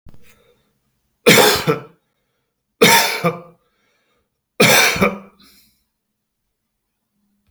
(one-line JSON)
{"three_cough_length": "7.5 s", "three_cough_amplitude": 32768, "three_cough_signal_mean_std_ratio": 0.35, "survey_phase": "beta (2021-08-13 to 2022-03-07)", "age": "65+", "gender": "Male", "wearing_mask": "No", "symptom_none": true, "smoker_status": "Never smoked", "respiratory_condition_asthma": false, "respiratory_condition_other": false, "recruitment_source": "REACT", "submission_delay": "2 days", "covid_test_result": "Negative", "covid_test_method": "RT-qPCR", "influenza_a_test_result": "Negative", "influenza_b_test_result": "Negative"}